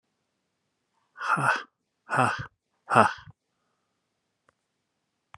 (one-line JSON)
{"exhalation_length": "5.4 s", "exhalation_amplitude": 26925, "exhalation_signal_mean_std_ratio": 0.29, "survey_phase": "beta (2021-08-13 to 2022-03-07)", "age": "45-64", "gender": "Male", "wearing_mask": "No", "symptom_none": true, "smoker_status": "Never smoked", "respiratory_condition_asthma": false, "respiratory_condition_other": false, "recruitment_source": "REACT", "submission_delay": "1 day", "covid_test_result": "Negative", "covid_test_method": "RT-qPCR"}